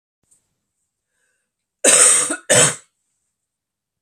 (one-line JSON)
{"cough_length": "4.0 s", "cough_amplitude": 32768, "cough_signal_mean_std_ratio": 0.34, "survey_phase": "beta (2021-08-13 to 2022-03-07)", "age": "18-44", "gender": "Female", "wearing_mask": "No", "symptom_cough_any": true, "symptom_shortness_of_breath": true, "symptom_fatigue": true, "symptom_change_to_sense_of_smell_or_taste": true, "symptom_loss_of_taste": true, "smoker_status": "Never smoked", "respiratory_condition_asthma": false, "respiratory_condition_other": false, "recruitment_source": "Test and Trace", "submission_delay": "2 days", "covid_test_result": "Positive", "covid_test_method": "RT-qPCR"}